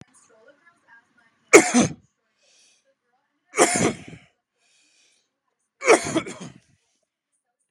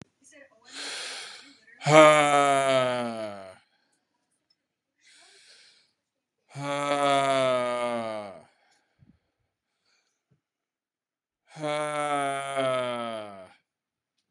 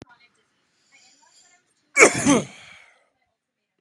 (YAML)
three_cough_length: 7.7 s
three_cough_amplitude: 32768
three_cough_signal_mean_std_ratio: 0.25
exhalation_length: 14.3 s
exhalation_amplitude: 26436
exhalation_signal_mean_std_ratio: 0.42
cough_length: 3.8 s
cough_amplitude: 32461
cough_signal_mean_std_ratio: 0.25
survey_phase: beta (2021-08-13 to 2022-03-07)
age: 18-44
gender: Male
wearing_mask: 'No'
symptom_none: true
smoker_status: Ex-smoker
respiratory_condition_asthma: false
respiratory_condition_other: false
recruitment_source: REACT
submission_delay: 0 days
covid_test_result: Negative
covid_test_method: RT-qPCR
influenza_a_test_result: Negative
influenza_b_test_result: Negative